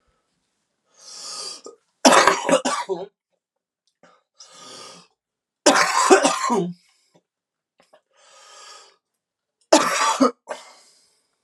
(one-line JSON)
{"three_cough_length": "11.4 s", "three_cough_amplitude": 32767, "three_cough_signal_mean_std_ratio": 0.35, "survey_phase": "alpha (2021-03-01 to 2021-08-12)", "age": "18-44", "gender": "Male", "wearing_mask": "No", "symptom_cough_any": true, "symptom_fever_high_temperature": true, "symptom_onset": "5 days", "smoker_status": "Never smoked", "respiratory_condition_asthma": false, "respiratory_condition_other": false, "recruitment_source": "Test and Trace", "submission_delay": "2 days", "covid_test_result": "Positive", "covid_test_method": "RT-qPCR", "covid_ct_value": 12.8, "covid_ct_gene": "N gene", "covid_ct_mean": 15.0, "covid_viral_load": "12000000 copies/ml", "covid_viral_load_category": "High viral load (>1M copies/ml)"}